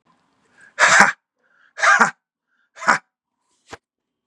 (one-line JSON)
{"exhalation_length": "4.3 s", "exhalation_amplitude": 32768, "exhalation_signal_mean_std_ratio": 0.32, "survey_phase": "beta (2021-08-13 to 2022-03-07)", "age": "18-44", "gender": "Male", "wearing_mask": "No", "symptom_none": true, "smoker_status": "Never smoked", "respiratory_condition_asthma": false, "respiratory_condition_other": false, "recruitment_source": "REACT", "submission_delay": "1 day", "covid_test_result": "Negative", "covid_test_method": "RT-qPCR", "influenza_a_test_result": "Negative", "influenza_b_test_result": "Negative"}